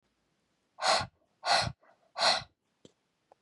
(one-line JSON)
{"exhalation_length": "3.4 s", "exhalation_amplitude": 8002, "exhalation_signal_mean_std_ratio": 0.37, "survey_phase": "beta (2021-08-13 to 2022-03-07)", "age": "18-44", "gender": "Female", "wearing_mask": "No", "symptom_sore_throat": true, "symptom_onset": "6 days", "smoker_status": "Never smoked", "respiratory_condition_asthma": false, "respiratory_condition_other": false, "recruitment_source": "REACT", "submission_delay": "1 day", "covid_test_result": "Negative", "covid_test_method": "RT-qPCR", "influenza_a_test_result": "Unknown/Void", "influenza_b_test_result": "Unknown/Void"}